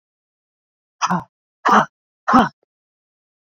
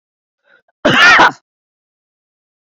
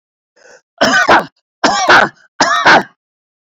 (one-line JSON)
{"exhalation_length": "3.5 s", "exhalation_amplitude": 32768, "exhalation_signal_mean_std_ratio": 0.3, "cough_length": "2.7 s", "cough_amplitude": 29090, "cough_signal_mean_std_ratio": 0.36, "three_cough_length": "3.6 s", "three_cough_amplitude": 30754, "three_cough_signal_mean_std_ratio": 0.52, "survey_phase": "beta (2021-08-13 to 2022-03-07)", "age": "45-64", "gender": "Male", "wearing_mask": "No", "symptom_none": true, "smoker_status": "Never smoked", "respiratory_condition_asthma": true, "respiratory_condition_other": false, "recruitment_source": "REACT", "submission_delay": "13 days", "covid_test_result": "Negative", "covid_test_method": "RT-qPCR"}